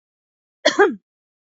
cough_length: 1.5 s
cough_amplitude: 27823
cough_signal_mean_std_ratio: 0.3
survey_phase: beta (2021-08-13 to 2022-03-07)
age: 18-44
gender: Female
wearing_mask: 'No'
symptom_cough_any: true
symptom_shortness_of_breath: true
symptom_sore_throat: true
symptom_diarrhoea: true
symptom_fatigue: true
symptom_headache: true
symptom_onset: 13 days
smoker_status: Never smoked
respiratory_condition_asthma: false
respiratory_condition_other: false
recruitment_source: REACT
submission_delay: 4 days
covid_test_result: Negative
covid_test_method: RT-qPCR
influenza_a_test_result: Negative
influenza_b_test_result: Negative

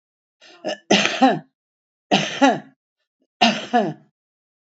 three_cough_length: 4.6 s
three_cough_amplitude: 29815
three_cough_signal_mean_std_ratio: 0.4
survey_phase: beta (2021-08-13 to 2022-03-07)
age: 65+
gender: Female
wearing_mask: 'No'
symptom_cough_any: true
symptom_change_to_sense_of_smell_or_taste: true
symptom_loss_of_taste: true
symptom_other: true
smoker_status: Current smoker (1 to 10 cigarettes per day)
respiratory_condition_asthma: true
respiratory_condition_other: false
recruitment_source: Test and Trace
submission_delay: 2 days
covid_test_result: Positive
covid_test_method: RT-qPCR
covid_ct_value: 25.6
covid_ct_gene: N gene
covid_ct_mean: 26.0
covid_viral_load: 3000 copies/ml
covid_viral_load_category: Minimal viral load (< 10K copies/ml)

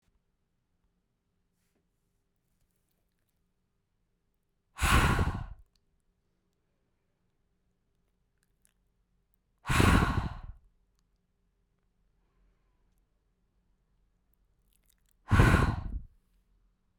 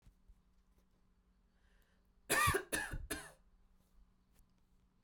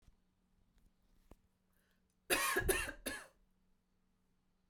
exhalation_length: 17.0 s
exhalation_amplitude: 17641
exhalation_signal_mean_std_ratio: 0.25
three_cough_length: 5.0 s
three_cough_amplitude: 3223
three_cough_signal_mean_std_ratio: 0.31
cough_length: 4.7 s
cough_amplitude: 3649
cough_signal_mean_std_ratio: 0.33
survey_phase: beta (2021-08-13 to 2022-03-07)
age: 18-44
gender: Female
wearing_mask: 'No'
symptom_none: true
symptom_onset: 6 days
smoker_status: Ex-smoker
respiratory_condition_asthma: false
respiratory_condition_other: false
recruitment_source: REACT
submission_delay: 2 days
covid_test_result: Negative
covid_test_method: RT-qPCR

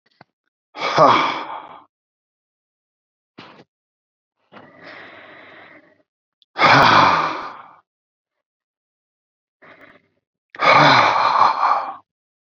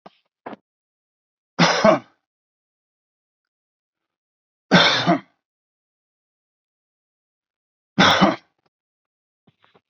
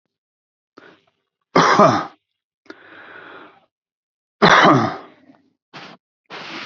exhalation_length: 12.5 s
exhalation_amplitude: 32768
exhalation_signal_mean_std_ratio: 0.38
three_cough_length: 9.9 s
three_cough_amplitude: 30221
three_cough_signal_mean_std_ratio: 0.27
cough_length: 6.7 s
cough_amplitude: 28759
cough_signal_mean_std_ratio: 0.33
survey_phase: beta (2021-08-13 to 2022-03-07)
age: 45-64
gender: Male
wearing_mask: 'No'
symptom_none: true
smoker_status: Ex-smoker
respiratory_condition_asthma: false
respiratory_condition_other: false
recruitment_source: REACT
submission_delay: 7 days
covid_test_result: Negative
covid_test_method: RT-qPCR
influenza_a_test_result: Unknown/Void
influenza_b_test_result: Unknown/Void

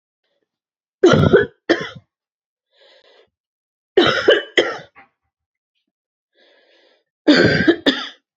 three_cough_length: 8.4 s
three_cough_amplitude: 31370
three_cough_signal_mean_std_ratio: 0.36
survey_phase: beta (2021-08-13 to 2022-03-07)
age: 18-44
gender: Female
wearing_mask: 'No'
symptom_cough_any: true
symptom_new_continuous_cough: true
symptom_runny_or_blocked_nose: true
symptom_shortness_of_breath: true
symptom_sore_throat: true
symptom_fatigue: true
symptom_fever_high_temperature: true
symptom_headache: true
symptom_change_to_sense_of_smell_or_taste: true
symptom_other: true
symptom_onset: 2 days
smoker_status: Never smoked
respiratory_condition_asthma: false
respiratory_condition_other: false
recruitment_source: Test and Trace
submission_delay: 2 days
covid_test_result: Positive
covid_test_method: RT-qPCR
covid_ct_value: 30.2
covid_ct_gene: ORF1ab gene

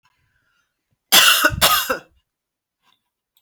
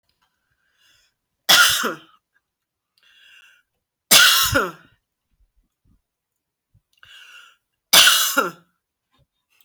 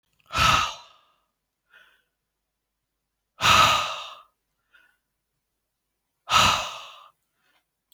cough_length: 3.4 s
cough_amplitude: 32768
cough_signal_mean_std_ratio: 0.36
three_cough_length: 9.6 s
three_cough_amplitude: 32768
three_cough_signal_mean_std_ratio: 0.3
exhalation_length: 7.9 s
exhalation_amplitude: 20854
exhalation_signal_mean_std_ratio: 0.32
survey_phase: alpha (2021-03-01 to 2021-08-12)
age: 45-64
gender: Female
wearing_mask: 'No'
symptom_none: true
symptom_onset: 13 days
smoker_status: Never smoked
respiratory_condition_asthma: false
respiratory_condition_other: false
recruitment_source: REACT
submission_delay: 1 day
covid_test_result: Negative
covid_test_method: RT-qPCR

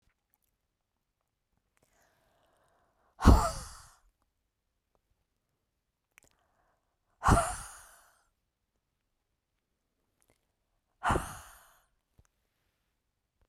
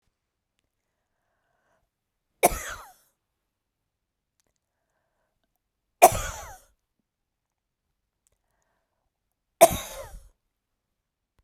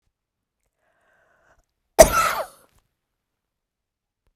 exhalation_length: 13.5 s
exhalation_amplitude: 18989
exhalation_signal_mean_std_ratio: 0.18
three_cough_length: 11.4 s
three_cough_amplitude: 32767
three_cough_signal_mean_std_ratio: 0.14
cough_length: 4.4 s
cough_amplitude: 32768
cough_signal_mean_std_ratio: 0.18
survey_phase: beta (2021-08-13 to 2022-03-07)
age: 65+
gender: Female
wearing_mask: 'No'
symptom_none: true
smoker_status: Never smoked
respiratory_condition_asthma: false
respiratory_condition_other: false
recruitment_source: REACT
submission_delay: 1 day
covid_test_result: Negative
covid_test_method: RT-qPCR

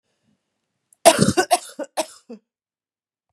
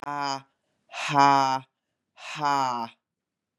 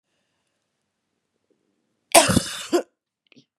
three_cough_length: 3.3 s
three_cough_amplitude: 32768
three_cough_signal_mean_std_ratio: 0.27
exhalation_length: 3.6 s
exhalation_amplitude: 20088
exhalation_signal_mean_std_ratio: 0.44
cough_length: 3.6 s
cough_amplitude: 32767
cough_signal_mean_std_ratio: 0.24
survey_phase: beta (2021-08-13 to 2022-03-07)
age: 45-64
gender: Female
wearing_mask: 'No'
symptom_cough_any: true
symptom_runny_or_blocked_nose: true
symptom_shortness_of_breath: true
symptom_sore_throat: true
symptom_fatigue: true
symptom_headache: true
symptom_change_to_sense_of_smell_or_taste: true
symptom_loss_of_taste: true
symptom_other: true
symptom_onset: 3 days
smoker_status: Ex-smoker
respiratory_condition_asthma: false
respiratory_condition_other: false
recruitment_source: Test and Trace
submission_delay: 1 day
covid_test_result: Positive
covid_test_method: RT-qPCR
covid_ct_value: 16.2
covid_ct_gene: ORF1ab gene
covid_ct_mean: 16.6
covid_viral_load: 3500000 copies/ml
covid_viral_load_category: High viral load (>1M copies/ml)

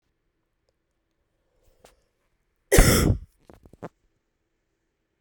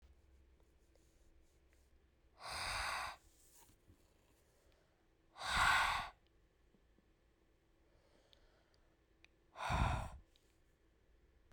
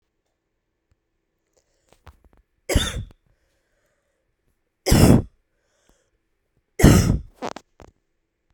cough_length: 5.2 s
cough_amplitude: 28973
cough_signal_mean_std_ratio: 0.23
exhalation_length: 11.5 s
exhalation_amplitude: 2797
exhalation_signal_mean_std_ratio: 0.34
three_cough_length: 8.5 s
three_cough_amplitude: 32768
three_cough_signal_mean_std_ratio: 0.26
survey_phase: beta (2021-08-13 to 2022-03-07)
age: 18-44
gender: Female
wearing_mask: 'No'
symptom_cough_any: true
symptom_runny_or_blocked_nose: true
symptom_shortness_of_breath: true
symptom_fatigue: true
symptom_headache: true
symptom_change_to_sense_of_smell_or_taste: true
symptom_loss_of_taste: true
symptom_onset: 5 days
smoker_status: Ex-smoker
respiratory_condition_asthma: false
respiratory_condition_other: false
recruitment_source: Test and Trace
submission_delay: 2 days
covid_test_result: Positive
covid_test_method: RT-qPCR
covid_ct_value: 23.2
covid_ct_gene: ORF1ab gene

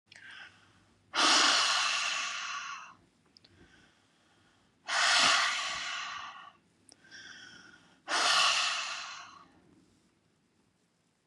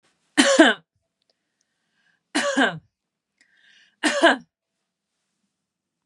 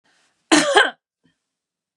exhalation_length: 11.3 s
exhalation_amplitude: 8843
exhalation_signal_mean_std_ratio: 0.49
three_cough_length: 6.1 s
three_cough_amplitude: 29690
three_cough_signal_mean_std_ratio: 0.3
cough_length: 2.0 s
cough_amplitude: 32767
cough_signal_mean_std_ratio: 0.33
survey_phase: beta (2021-08-13 to 2022-03-07)
age: 45-64
gender: Female
wearing_mask: 'No'
symptom_none: true
smoker_status: Never smoked
respiratory_condition_asthma: false
respiratory_condition_other: false
recruitment_source: REACT
submission_delay: 1 day
covid_test_result: Negative
covid_test_method: RT-qPCR
influenza_a_test_result: Negative
influenza_b_test_result: Negative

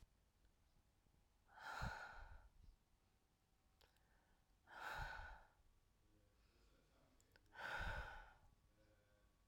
exhalation_length: 9.5 s
exhalation_amplitude: 512
exhalation_signal_mean_std_ratio: 0.46
survey_phase: alpha (2021-03-01 to 2021-08-12)
age: 45-64
gender: Female
wearing_mask: 'No'
symptom_cough_any: true
symptom_shortness_of_breath: true
symptom_fatigue: true
symptom_fever_high_temperature: true
symptom_headache: true
symptom_change_to_sense_of_smell_or_taste: true
symptom_loss_of_taste: true
symptom_onset: 2 days
smoker_status: Never smoked
respiratory_condition_asthma: false
respiratory_condition_other: false
recruitment_source: Test and Trace
submission_delay: 2 days
covid_test_result: Positive
covid_test_method: RT-qPCR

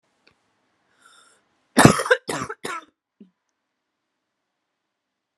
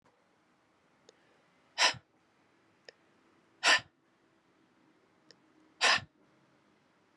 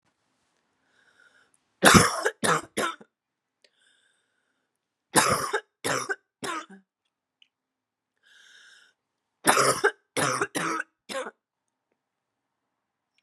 cough_length: 5.4 s
cough_amplitude: 32768
cough_signal_mean_std_ratio: 0.2
exhalation_length: 7.2 s
exhalation_amplitude: 9213
exhalation_signal_mean_std_ratio: 0.22
three_cough_length: 13.2 s
three_cough_amplitude: 30399
three_cough_signal_mean_std_ratio: 0.31
survey_phase: beta (2021-08-13 to 2022-03-07)
age: 18-44
gender: Female
wearing_mask: 'No'
symptom_cough_any: true
symptom_new_continuous_cough: true
symptom_runny_or_blocked_nose: true
symptom_fatigue: true
smoker_status: Never smoked
respiratory_condition_asthma: false
respiratory_condition_other: false
recruitment_source: Test and Trace
submission_delay: 2 days
covid_test_result: Positive
covid_test_method: ePCR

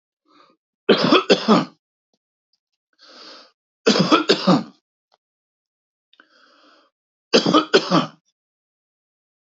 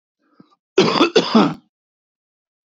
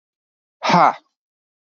three_cough_length: 9.5 s
three_cough_amplitude: 31835
three_cough_signal_mean_std_ratio: 0.33
cough_length: 2.7 s
cough_amplitude: 27992
cough_signal_mean_std_ratio: 0.38
exhalation_length: 1.8 s
exhalation_amplitude: 28722
exhalation_signal_mean_std_ratio: 0.3
survey_phase: beta (2021-08-13 to 2022-03-07)
age: 45-64
gender: Male
wearing_mask: 'No'
symptom_cough_any: true
symptom_sore_throat: true
symptom_fever_high_temperature: true
symptom_headache: true
smoker_status: Current smoker (11 or more cigarettes per day)
respiratory_condition_asthma: false
respiratory_condition_other: false
recruitment_source: Test and Trace
submission_delay: 2 days
covid_test_result: Positive
covid_test_method: LFT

